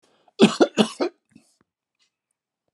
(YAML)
cough_length: 2.7 s
cough_amplitude: 27984
cough_signal_mean_std_ratio: 0.27
survey_phase: alpha (2021-03-01 to 2021-08-12)
age: 65+
gender: Male
wearing_mask: 'No'
symptom_none: true
smoker_status: Never smoked
respiratory_condition_asthma: false
respiratory_condition_other: true
recruitment_source: REACT
submission_delay: 1 day
covid_test_result: Negative
covid_test_method: RT-qPCR